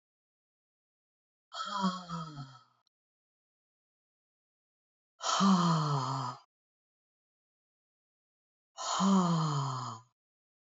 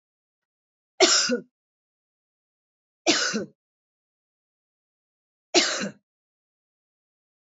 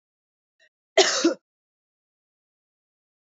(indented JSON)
{
  "exhalation_length": "10.8 s",
  "exhalation_amplitude": 5095,
  "exhalation_signal_mean_std_ratio": 0.42,
  "three_cough_length": "7.6 s",
  "three_cough_amplitude": 24337,
  "three_cough_signal_mean_std_ratio": 0.28,
  "cough_length": "3.2 s",
  "cough_amplitude": 21575,
  "cough_signal_mean_std_ratio": 0.24,
  "survey_phase": "beta (2021-08-13 to 2022-03-07)",
  "age": "45-64",
  "gender": "Male",
  "wearing_mask": "Yes",
  "symptom_cough_any": true,
  "symptom_runny_or_blocked_nose": true,
  "symptom_sore_throat": true,
  "symptom_fatigue": true,
  "symptom_headache": true,
  "symptom_other": true,
  "smoker_status": "Never smoked",
  "respiratory_condition_asthma": false,
  "respiratory_condition_other": false,
  "recruitment_source": "Test and Trace",
  "submission_delay": "1 day",
  "covid_test_result": "Negative",
  "covid_test_method": "RT-qPCR"
}